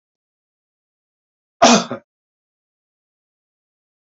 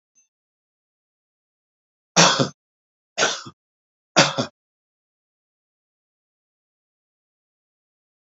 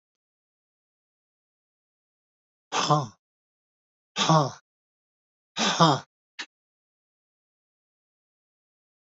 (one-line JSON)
{"cough_length": "4.1 s", "cough_amplitude": 30042, "cough_signal_mean_std_ratio": 0.19, "three_cough_length": "8.3 s", "three_cough_amplitude": 30458, "three_cough_signal_mean_std_ratio": 0.21, "exhalation_length": "9.0 s", "exhalation_amplitude": 22951, "exhalation_signal_mean_std_ratio": 0.25, "survey_phase": "beta (2021-08-13 to 2022-03-07)", "age": "65+", "gender": "Male", "wearing_mask": "No", "symptom_none": true, "smoker_status": "Ex-smoker", "respiratory_condition_asthma": false, "respiratory_condition_other": false, "recruitment_source": "REACT", "submission_delay": "1 day", "covid_test_result": "Negative", "covid_test_method": "RT-qPCR"}